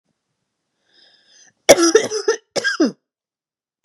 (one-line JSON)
{"cough_length": "3.8 s", "cough_amplitude": 32768, "cough_signal_mean_std_ratio": 0.32, "survey_phase": "beta (2021-08-13 to 2022-03-07)", "age": "45-64", "gender": "Female", "wearing_mask": "No", "symptom_fatigue": true, "smoker_status": "Never smoked", "respiratory_condition_asthma": false, "respiratory_condition_other": false, "recruitment_source": "REACT", "submission_delay": "1 day", "covid_test_result": "Negative", "covid_test_method": "RT-qPCR", "influenza_a_test_result": "Negative", "influenza_b_test_result": "Negative"}